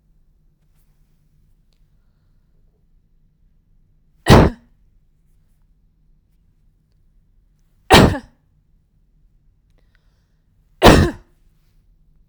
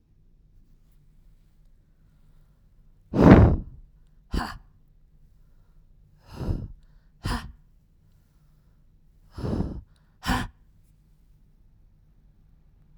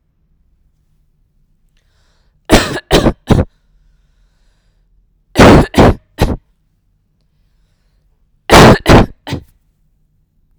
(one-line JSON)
{"cough_length": "12.3 s", "cough_amplitude": 32768, "cough_signal_mean_std_ratio": 0.2, "exhalation_length": "13.0 s", "exhalation_amplitude": 32768, "exhalation_signal_mean_std_ratio": 0.24, "three_cough_length": "10.6 s", "three_cough_amplitude": 32768, "three_cough_signal_mean_std_ratio": 0.33, "survey_phase": "alpha (2021-03-01 to 2021-08-12)", "age": "18-44", "gender": "Female", "wearing_mask": "Yes", "symptom_none": true, "smoker_status": "Never smoked", "respiratory_condition_asthma": false, "respiratory_condition_other": false, "recruitment_source": "Test and Trace", "submission_delay": "0 days", "covid_test_result": "Negative", "covid_test_method": "LFT"}